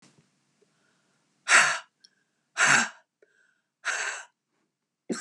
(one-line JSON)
{"exhalation_length": "5.2 s", "exhalation_amplitude": 18446, "exhalation_signal_mean_std_ratio": 0.31, "survey_phase": "beta (2021-08-13 to 2022-03-07)", "age": "65+", "gender": "Female", "wearing_mask": "No", "symptom_cough_any": true, "symptom_runny_or_blocked_nose": true, "symptom_shortness_of_breath": true, "symptom_onset": "10 days", "smoker_status": "Never smoked", "respiratory_condition_asthma": false, "respiratory_condition_other": false, "recruitment_source": "REACT", "submission_delay": "3 days", "covid_test_result": "Positive", "covid_test_method": "RT-qPCR", "covid_ct_value": 25.0, "covid_ct_gene": "E gene", "influenza_a_test_result": "Negative", "influenza_b_test_result": "Negative"}